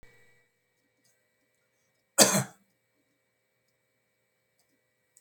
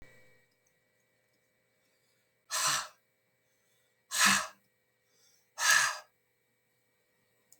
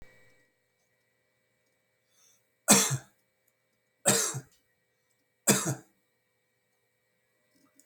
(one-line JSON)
{"cough_length": "5.2 s", "cough_amplitude": 22386, "cough_signal_mean_std_ratio": 0.16, "exhalation_length": "7.6 s", "exhalation_amplitude": 8135, "exhalation_signal_mean_std_ratio": 0.29, "three_cough_length": "7.9 s", "three_cough_amplitude": 18417, "three_cough_signal_mean_std_ratio": 0.24, "survey_phase": "beta (2021-08-13 to 2022-03-07)", "age": "65+", "gender": "Male", "wearing_mask": "No", "symptom_runny_or_blocked_nose": true, "symptom_onset": "5 days", "smoker_status": "Ex-smoker", "respiratory_condition_asthma": false, "respiratory_condition_other": false, "recruitment_source": "REACT", "submission_delay": "3 days", "covid_test_result": "Negative", "covid_test_method": "RT-qPCR", "influenza_a_test_result": "Negative", "influenza_b_test_result": "Negative"}